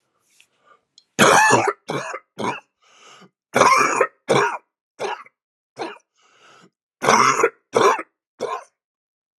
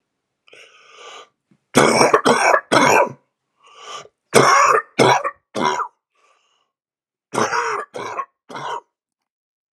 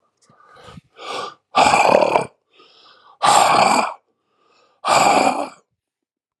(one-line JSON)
{"cough_length": "9.4 s", "cough_amplitude": 32001, "cough_signal_mean_std_ratio": 0.42, "three_cough_length": "9.7 s", "three_cough_amplitude": 32768, "three_cough_signal_mean_std_ratio": 0.44, "exhalation_length": "6.4 s", "exhalation_amplitude": 32768, "exhalation_signal_mean_std_ratio": 0.47, "survey_phase": "alpha (2021-03-01 to 2021-08-12)", "age": "45-64", "gender": "Male", "wearing_mask": "No", "symptom_cough_any": true, "symptom_fatigue": true, "symptom_headache": true, "symptom_onset": "2 days", "smoker_status": "Never smoked", "respiratory_condition_asthma": false, "respiratory_condition_other": false, "recruitment_source": "Test and Trace", "submission_delay": "1 day", "covid_test_result": "Positive", "covid_test_method": "RT-qPCR", "covid_ct_value": 18.1, "covid_ct_gene": "ORF1ab gene"}